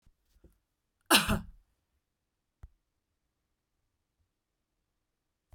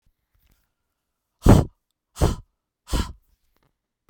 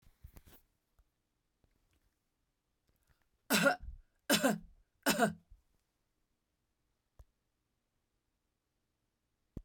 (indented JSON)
{
  "cough_length": "5.5 s",
  "cough_amplitude": 19298,
  "cough_signal_mean_std_ratio": 0.17,
  "exhalation_length": "4.1 s",
  "exhalation_amplitude": 32768,
  "exhalation_signal_mean_std_ratio": 0.24,
  "three_cough_length": "9.6 s",
  "three_cough_amplitude": 5991,
  "three_cough_signal_mean_std_ratio": 0.24,
  "survey_phase": "beta (2021-08-13 to 2022-03-07)",
  "age": "45-64",
  "gender": "Female",
  "wearing_mask": "No",
  "symptom_none": true,
  "smoker_status": "Never smoked",
  "respiratory_condition_asthma": false,
  "respiratory_condition_other": false,
  "recruitment_source": "REACT",
  "submission_delay": "2 days",
  "covid_test_result": "Negative",
  "covid_test_method": "RT-qPCR",
  "influenza_a_test_result": "Negative",
  "influenza_b_test_result": "Negative"
}